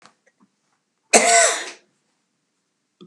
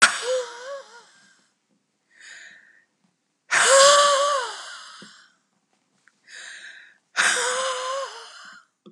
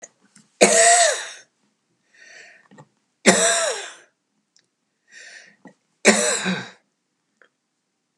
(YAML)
cough_length: 3.1 s
cough_amplitude: 32584
cough_signal_mean_std_ratio: 0.31
exhalation_length: 8.9 s
exhalation_amplitude: 30310
exhalation_signal_mean_std_ratio: 0.41
three_cough_length: 8.2 s
three_cough_amplitude: 32768
three_cough_signal_mean_std_ratio: 0.35
survey_phase: beta (2021-08-13 to 2022-03-07)
age: 65+
gender: Female
wearing_mask: 'No'
symptom_none: true
smoker_status: Never smoked
respiratory_condition_asthma: true
respiratory_condition_other: false
recruitment_source: REACT
submission_delay: 1 day
covid_test_result: Negative
covid_test_method: RT-qPCR
influenza_a_test_result: Negative
influenza_b_test_result: Negative